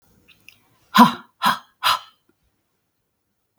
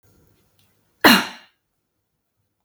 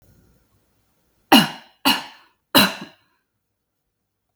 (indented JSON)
{
  "exhalation_length": "3.6 s",
  "exhalation_amplitude": 32768,
  "exhalation_signal_mean_std_ratio": 0.25,
  "cough_length": "2.6 s",
  "cough_amplitude": 32768,
  "cough_signal_mean_std_ratio": 0.21,
  "three_cough_length": "4.4 s",
  "three_cough_amplitude": 32768,
  "three_cough_signal_mean_std_ratio": 0.25,
  "survey_phase": "beta (2021-08-13 to 2022-03-07)",
  "age": "18-44",
  "gender": "Female",
  "wearing_mask": "No",
  "symptom_runny_or_blocked_nose": true,
  "symptom_onset": "12 days",
  "smoker_status": "Never smoked",
  "respiratory_condition_asthma": false,
  "respiratory_condition_other": false,
  "recruitment_source": "REACT",
  "submission_delay": "0 days",
  "covid_test_result": "Negative",
  "covid_test_method": "RT-qPCR",
  "influenza_a_test_result": "Negative",
  "influenza_b_test_result": "Negative"
}